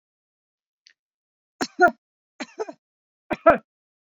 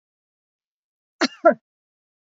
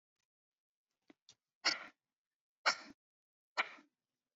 {
  "three_cough_length": "4.0 s",
  "three_cough_amplitude": 30421,
  "three_cough_signal_mean_std_ratio": 0.21,
  "cough_length": "2.3 s",
  "cough_amplitude": 28083,
  "cough_signal_mean_std_ratio": 0.19,
  "exhalation_length": "4.4 s",
  "exhalation_amplitude": 4000,
  "exhalation_signal_mean_std_ratio": 0.2,
  "survey_phase": "beta (2021-08-13 to 2022-03-07)",
  "age": "45-64",
  "gender": "Female",
  "wearing_mask": "No",
  "symptom_none": true,
  "smoker_status": "Never smoked",
  "recruitment_source": "REACT",
  "submission_delay": "1 day",
  "covid_test_result": "Negative",
  "covid_test_method": "RT-qPCR",
  "influenza_a_test_result": "Negative",
  "influenza_b_test_result": "Negative"
}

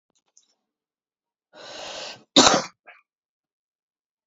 {
  "cough_length": "4.3 s",
  "cough_amplitude": 31926,
  "cough_signal_mean_std_ratio": 0.22,
  "survey_phase": "alpha (2021-03-01 to 2021-08-12)",
  "age": "18-44",
  "gender": "Male",
  "wearing_mask": "No",
  "symptom_cough_any": true,
  "symptom_new_continuous_cough": true,
  "symptom_diarrhoea": true,
  "symptom_fatigue": true,
  "symptom_onset": "3 days",
  "smoker_status": "Current smoker (e-cigarettes or vapes only)",
  "respiratory_condition_asthma": false,
  "respiratory_condition_other": false,
  "recruitment_source": "Test and Trace",
  "submission_delay": "2 days",
  "covid_test_result": "Positive",
  "covid_test_method": "ePCR"
}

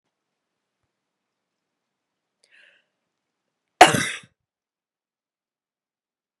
{
  "cough_length": "6.4 s",
  "cough_amplitude": 32768,
  "cough_signal_mean_std_ratio": 0.12,
  "survey_phase": "beta (2021-08-13 to 2022-03-07)",
  "age": "18-44",
  "gender": "Female",
  "wearing_mask": "No",
  "symptom_cough_any": true,
  "symptom_runny_or_blocked_nose": true,
  "symptom_sore_throat": true,
  "symptom_fatigue": true,
  "symptom_fever_high_temperature": true,
  "symptom_change_to_sense_of_smell_or_taste": true,
  "symptom_onset": "3 days",
  "smoker_status": "Never smoked",
  "respiratory_condition_asthma": false,
  "respiratory_condition_other": false,
  "recruitment_source": "Test and Trace",
  "submission_delay": "2 days",
  "covid_test_result": "Positive",
  "covid_test_method": "RT-qPCR",
  "covid_ct_value": 30.0,
  "covid_ct_gene": "ORF1ab gene",
  "covid_ct_mean": 31.1,
  "covid_viral_load": "61 copies/ml",
  "covid_viral_load_category": "Minimal viral load (< 10K copies/ml)"
}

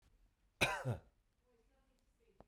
{
  "cough_length": "2.5 s",
  "cough_amplitude": 3729,
  "cough_signal_mean_std_ratio": 0.29,
  "survey_phase": "beta (2021-08-13 to 2022-03-07)",
  "age": "45-64",
  "gender": "Male",
  "wearing_mask": "No",
  "symptom_none": true,
  "smoker_status": "Ex-smoker",
  "respiratory_condition_asthma": false,
  "respiratory_condition_other": false,
  "recruitment_source": "REACT",
  "submission_delay": "2 days",
  "covid_test_result": "Negative",
  "covid_test_method": "RT-qPCR",
  "influenza_a_test_result": "Negative",
  "influenza_b_test_result": "Negative"
}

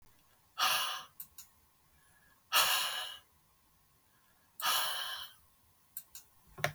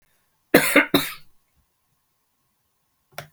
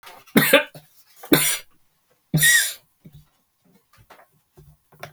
{
  "exhalation_length": "6.7 s",
  "exhalation_amplitude": 7765,
  "exhalation_signal_mean_std_ratio": 0.42,
  "cough_length": "3.3 s",
  "cough_amplitude": 32766,
  "cough_signal_mean_std_ratio": 0.27,
  "three_cough_length": "5.1 s",
  "three_cough_amplitude": 32768,
  "three_cough_signal_mean_std_ratio": 0.34,
  "survey_phase": "beta (2021-08-13 to 2022-03-07)",
  "age": "65+",
  "gender": "Female",
  "wearing_mask": "No",
  "symptom_none": true,
  "smoker_status": "Never smoked",
  "respiratory_condition_asthma": false,
  "respiratory_condition_other": false,
  "recruitment_source": "REACT",
  "submission_delay": "4 days",
  "covid_test_result": "Negative",
  "covid_test_method": "RT-qPCR",
  "influenza_a_test_result": "Negative",
  "influenza_b_test_result": "Negative"
}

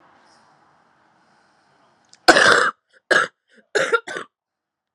{
  "three_cough_length": "4.9 s",
  "three_cough_amplitude": 32768,
  "three_cough_signal_mean_std_ratio": 0.31,
  "survey_phase": "alpha (2021-03-01 to 2021-08-12)",
  "age": "18-44",
  "gender": "Female",
  "wearing_mask": "No",
  "symptom_cough_any": true,
  "symptom_new_continuous_cough": true,
  "symptom_abdominal_pain": true,
  "symptom_fatigue": true,
  "symptom_fever_high_temperature": true,
  "symptom_headache": true,
  "symptom_change_to_sense_of_smell_or_taste": true,
  "symptom_onset": "3 days",
  "smoker_status": "Ex-smoker",
  "respiratory_condition_asthma": true,
  "respiratory_condition_other": false,
  "recruitment_source": "Test and Trace",
  "submission_delay": "1 day",
  "covid_test_result": "Positive",
  "covid_test_method": "RT-qPCR",
  "covid_ct_value": 12.6,
  "covid_ct_gene": "ORF1ab gene",
  "covid_ct_mean": 13.2,
  "covid_viral_load": "48000000 copies/ml",
  "covid_viral_load_category": "High viral load (>1M copies/ml)"
}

